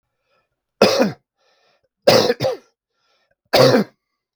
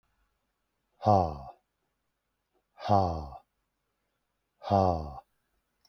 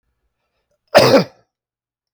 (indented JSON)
{
  "three_cough_length": "4.4 s",
  "three_cough_amplitude": 32768,
  "three_cough_signal_mean_std_ratio": 0.38,
  "exhalation_length": "5.9 s",
  "exhalation_amplitude": 11831,
  "exhalation_signal_mean_std_ratio": 0.3,
  "cough_length": "2.1 s",
  "cough_amplitude": 32766,
  "cough_signal_mean_std_ratio": 0.3,
  "survey_phase": "beta (2021-08-13 to 2022-03-07)",
  "age": "45-64",
  "gender": "Male",
  "wearing_mask": "No",
  "symptom_cough_any": true,
  "symptom_runny_or_blocked_nose": true,
  "symptom_fatigue": true,
  "symptom_headache": true,
  "symptom_change_to_sense_of_smell_or_taste": true,
  "symptom_onset": "5 days",
  "smoker_status": "Ex-smoker",
  "respiratory_condition_asthma": false,
  "respiratory_condition_other": false,
  "recruitment_source": "Test and Trace",
  "submission_delay": "2 days",
  "covid_test_result": "Positive",
  "covid_test_method": "RT-qPCR",
  "covid_ct_value": 15.3,
  "covid_ct_gene": "ORF1ab gene",
  "covid_ct_mean": 15.8,
  "covid_viral_load": "6400000 copies/ml",
  "covid_viral_load_category": "High viral load (>1M copies/ml)"
}